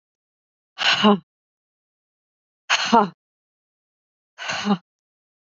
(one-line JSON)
{"exhalation_length": "5.5 s", "exhalation_amplitude": 26798, "exhalation_signal_mean_std_ratio": 0.31, "survey_phase": "beta (2021-08-13 to 2022-03-07)", "age": "45-64", "gender": "Female", "wearing_mask": "No", "symptom_headache": true, "smoker_status": "Ex-smoker", "respiratory_condition_asthma": false, "respiratory_condition_other": false, "recruitment_source": "REACT", "submission_delay": "3 days", "covid_test_result": "Negative", "covid_test_method": "RT-qPCR", "influenza_a_test_result": "Negative", "influenza_b_test_result": "Negative"}